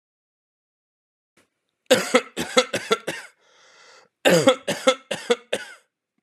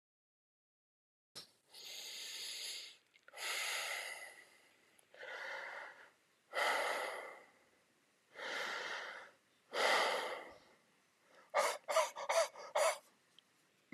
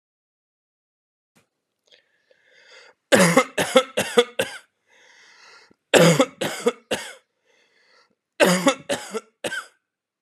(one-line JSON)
{"cough_length": "6.2 s", "cough_amplitude": 31047, "cough_signal_mean_std_ratio": 0.34, "exhalation_length": "13.9 s", "exhalation_amplitude": 3345, "exhalation_signal_mean_std_ratio": 0.49, "three_cough_length": "10.2 s", "three_cough_amplitude": 32768, "three_cough_signal_mean_std_ratio": 0.33, "survey_phase": "alpha (2021-03-01 to 2021-08-12)", "age": "45-64", "gender": "Male", "wearing_mask": "No", "symptom_none": true, "symptom_onset": "13 days", "smoker_status": "Current smoker (1 to 10 cigarettes per day)", "respiratory_condition_asthma": false, "respiratory_condition_other": false, "recruitment_source": "REACT", "submission_delay": "2 days", "covid_test_result": "Negative", "covid_test_method": "RT-qPCR"}